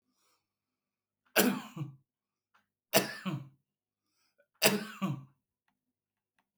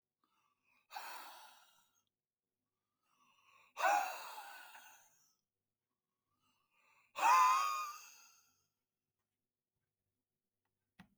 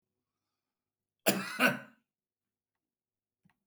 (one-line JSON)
{"three_cough_length": "6.6 s", "three_cough_amplitude": 16258, "three_cough_signal_mean_std_ratio": 0.29, "exhalation_length": "11.2 s", "exhalation_amplitude": 3846, "exhalation_signal_mean_std_ratio": 0.27, "cough_length": "3.7 s", "cough_amplitude": 11721, "cough_signal_mean_std_ratio": 0.24, "survey_phase": "beta (2021-08-13 to 2022-03-07)", "age": "45-64", "gender": "Male", "wearing_mask": "No", "symptom_none": true, "smoker_status": "Never smoked", "respiratory_condition_asthma": false, "respiratory_condition_other": false, "recruitment_source": "REACT", "submission_delay": "1 day", "covid_test_result": "Negative", "covid_test_method": "RT-qPCR", "influenza_a_test_result": "Negative", "influenza_b_test_result": "Negative"}